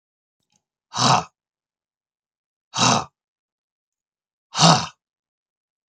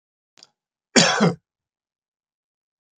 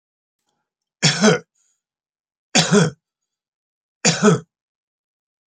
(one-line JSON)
{"exhalation_length": "5.9 s", "exhalation_amplitude": 32246, "exhalation_signal_mean_std_ratio": 0.28, "cough_length": "3.0 s", "cough_amplitude": 32581, "cough_signal_mean_std_ratio": 0.27, "three_cough_length": "5.5 s", "three_cough_amplitude": 32767, "three_cough_signal_mean_std_ratio": 0.33, "survey_phase": "beta (2021-08-13 to 2022-03-07)", "age": "65+", "gender": "Male", "wearing_mask": "No", "symptom_none": true, "smoker_status": "Ex-smoker", "respiratory_condition_asthma": false, "respiratory_condition_other": false, "recruitment_source": "REACT", "submission_delay": "1 day", "covid_test_result": "Negative", "covid_test_method": "RT-qPCR", "influenza_a_test_result": "Negative", "influenza_b_test_result": "Negative"}